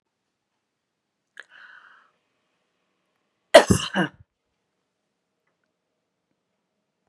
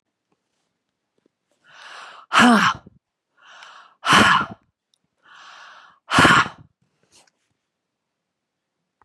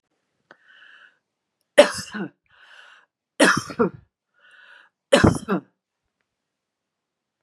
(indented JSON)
{
  "cough_length": "7.1 s",
  "cough_amplitude": 32768,
  "cough_signal_mean_std_ratio": 0.14,
  "exhalation_length": "9.0 s",
  "exhalation_amplitude": 31095,
  "exhalation_signal_mean_std_ratio": 0.3,
  "three_cough_length": "7.4 s",
  "three_cough_amplitude": 32767,
  "three_cough_signal_mean_std_ratio": 0.25,
  "survey_phase": "beta (2021-08-13 to 2022-03-07)",
  "age": "45-64",
  "gender": "Female",
  "wearing_mask": "No",
  "symptom_none": true,
  "symptom_onset": "12 days",
  "smoker_status": "Never smoked",
  "respiratory_condition_asthma": false,
  "respiratory_condition_other": false,
  "recruitment_source": "REACT",
  "submission_delay": "2 days",
  "covid_test_result": "Negative",
  "covid_test_method": "RT-qPCR",
  "influenza_a_test_result": "Negative",
  "influenza_b_test_result": "Negative"
}